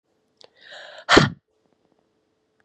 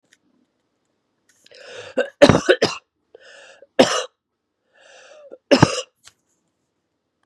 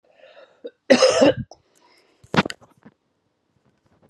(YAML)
exhalation_length: 2.6 s
exhalation_amplitude: 32768
exhalation_signal_mean_std_ratio: 0.22
three_cough_length: 7.3 s
three_cough_amplitude: 32768
three_cough_signal_mean_std_ratio: 0.25
cough_length: 4.1 s
cough_amplitude: 29169
cough_signal_mean_std_ratio: 0.29
survey_phase: beta (2021-08-13 to 2022-03-07)
age: 45-64
gender: Female
wearing_mask: 'No'
symptom_runny_or_blocked_nose: true
smoker_status: Never smoked
respiratory_condition_asthma: true
respiratory_condition_other: false
recruitment_source: REACT
submission_delay: 0 days
covid_test_result: Negative
covid_test_method: RT-qPCR
influenza_a_test_result: Negative
influenza_b_test_result: Negative